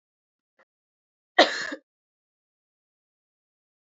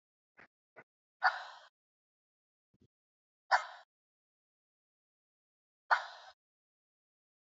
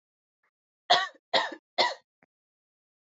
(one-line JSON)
{"cough_length": "3.8 s", "cough_amplitude": 23511, "cough_signal_mean_std_ratio": 0.16, "exhalation_length": "7.4 s", "exhalation_amplitude": 6310, "exhalation_signal_mean_std_ratio": 0.17, "three_cough_length": "3.1 s", "three_cough_amplitude": 13837, "three_cough_signal_mean_std_ratio": 0.29, "survey_phase": "beta (2021-08-13 to 2022-03-07)", "age": "18-44", "gender": "Female", "wearing_mask": "No", "symptom_runny_or_blocked_nose": true, "symptom_other": true, "smoker_status": "Never smoked", "respiratory_condition_asthma": false, "respiratory_condition_other": false, "recruitment_source": "Test and Trace", "submission_delay": "2 days", "covid_test_result": "Positive", "covid_test_method": "RT-qPCR", "covid_ct_value": 27.9, "covid_ct_gene": "N gene"}